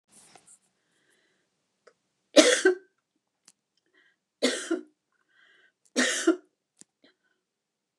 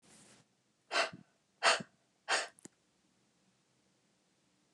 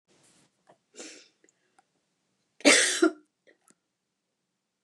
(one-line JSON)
{"three_cough_length": "8.0 s", "three_cough_amplitude": 27713, "three_cough_signal_mean_std_ratio": 0.25, "exhalation_length": "4.7 s", "exhalation_amplitude": 5864, "exhalation_signal_mean_std_ratio": 0.26, "cough_length": "4.8 s", "cough_amplitude": 20817, "cough_signal_mean_std_ratio": 0.23, "survey_phase": "beta (2021-08-13 to 2022-03-07)", "age": "65+", "gender": "Female", "wearing_mask": "No", "symptom_none": true, "smoker_status": "Never smoked", "respiratory_condition_asthma": false, "respiratory_condition_other": false, "recruitment_source": "REACT", "submission_delay": "3 days", "covid_test_result": "Negative", "covid_test_method": "RT-qPCR", "influenza_a_test_result": "Negative", "influenza_b_test_result": "Negative"}